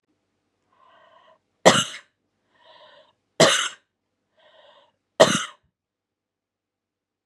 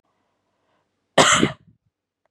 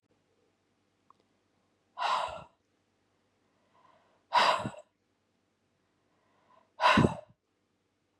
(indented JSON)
{
  "three_cough_length": "7.3 s",
  "three_cough_amplitude": 32768,
  "three_cough_signal_mean_std_ratio": 0.22,
  "cough_length": "2.3 s",
  "cough_amplitude": 32767,
  "cough_signal_mean_std_ratio": 0.28,
  "exhalation_length": "8.2 s",
  "exhalation_amplitude": 11512,
  "exhalation_signal_mean_std_ratio": 0.27,
  "survey_phase": "beta (2021-08-13 to 2022-03-07)",
  "age": "65+",
  "gender": "Female",
  "wearing_mask": "No",
  "symptom_change_to_sense_of_smell_or_taste": true,
  "symptom_loss_of_taste": true,
  "symptom_onset": "7 days",
  "smoker_status": "Never smoked",
  "respiratory_condition_asthma": false,
  "respiratory_condition_other": false,
  "recruitment_source": "Test and Trace",
  "submission_delay": "1 day",
  "covid_test_result": "Positive",
  "covid_test_method": "RT-qPCR",
  "covid_ct_value": 19.1,
  "covid_ct_gene": "ORF1ab gene",
  "covid_ct_mean": 19.5,
  "covid_viral_load": "390000 copies/ml",
  "covid_viral_load_category": "Low viral load (10K-1M copies/ml)"
}